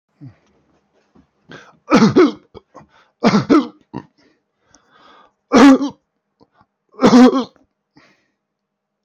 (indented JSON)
{
  "three_cough_length": "9.0 s",
  "three_cough_amplitude": 32767,
  "three_cough_signal_mean_std_ratio": 0.34,
  "survey_phase": "alpha (2021-03-01 to 2021-08-12)",
  "age": "18-44",
  "gender": "Male",
  "wearing_mask": "No",
  "symptom_none": true,
  "smoker_status": "Never smoked",
  "respiratory_condition_asthma": false,
  "respiratory_condition_other": false,
  "recruitment_source": "REACT",
  "submission_delay": "0 days",
  "covid_test_result": "Negative",
  "covid_test_method": "RT-qPCR"
}